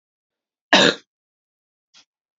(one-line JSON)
{"cough_length": "2.4 s", "cough_amplitude": 30779, "cough_signal_mean_std_ratio": 0.22, "survey_phase": "beta (2021-08-13 to 2022-03-07)", "age": "45-64", "gender": "Female", "wearing_mask": "No", "symptom_runny_or_blocked_nose": true, "symptom_onset": "3 days", "smoker_status": "Ex-smoker", "respiratory_condition_asthma": false, "respiratory_condition_other": false, "recruitment_source": "Test and Trace", "submission_delay": "2 days", "covid_test_result": "Positive", "covid_test_method": "RT-qPCR", "covid_ct_value": 23.3, "covid_ct_gene": "ORF1ab gene"}